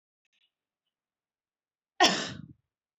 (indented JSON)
{
  "cough_length": "3.0 s",
  "cough_amplitude": 16200,
  "cough_signal_mean_std_ratio": 0.22,
  "survey_phase": "beta (2021-08-13 to 2022-03-07)",
  "age": "18-44",
  "gender": "Female",
  "wearing_mask": "No",
  "symptom_runny_or_blocked_nose": true,
  "symptom_onset": "8 days",
  "smoker_status": "Never smoked",
  "respiratory_condition_asthma": true,
  "respiratory_condition_other": false,
  "recruitment_source": "REACT",
  "submission_delay": "3 days",
  "covid_test_result": "Negative",
  "covid_test_method": "RT-qPCR",
  "influenza_a_test_result": "Negative",
  "influenza_b_test_result": "Negative"
}